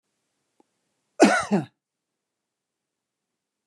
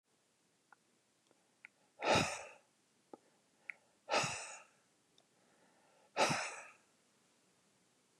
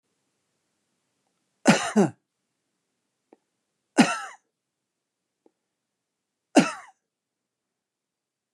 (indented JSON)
{
  "cough_length": "3.7 s",
  "cough_amplitude": 28338,
  "cough_signal_mean_std_ratio": 0.23,
  "exhalation_length": "8.2 s",
  "exhalation_amplitude": 3988,
  "exhalation_signal_mean_std_ratio": 0.3,
  "three_cough_length": "8.5 s",
  "three_cough_amplitude": 22423,
  "three_cough_signal_mean_std_ratio": 0.2,
  "survey_phase": "beta (2021-08-13 to 2022-03-07)",
  "age": "65+",
  "gender": "Male",
  "wearing_mask": "No",
  "symptom_none": true,
  "smoker_status": "Never smoked",
  "respiratory_condition_asthma": false,
  "respiratory_condition_other": false,
  "recruitment_source": "REACT",
  "submission_delay": "1 day",
  "covid_test_result": "Negative",
  "covid_test_method": "RT-qPCR",
  "influenza_a_test_result": "Negative",
  "influenza_b_test_result": "Negative"
}